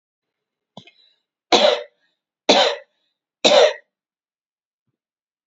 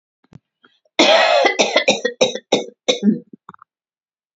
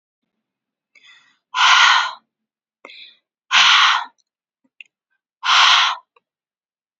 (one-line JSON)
{"three_cough_length": "5.5 s", "three_cough_amplitude": 32768, "three_cough_signal_mean_std_ratio": 0.3, "cough_length": "4.4 s", "cough_amplitude": 32767, "cough_signal_mean_std_ratio": 0.47, "exhalation_length": "7.0 s", "exhalation_amplitude": 31056, "exhalation_signal_mean_std_ratio": 0.39, "survey_phase": "beta (2021-08-13 to 2022-03-07)", "age": "45-64", "gender": "Female", "wearing_mask": "No", "symptom_none": true, "smoker_status": "Ex-smoker", "respiratory_condition_asthma": false, "respiratory_condition_other": false, "recruitment_source": "REACT", "submission_delay": "2 days", "covid_test_result": "Negative", "covid_test_method": "RT-qPCR"}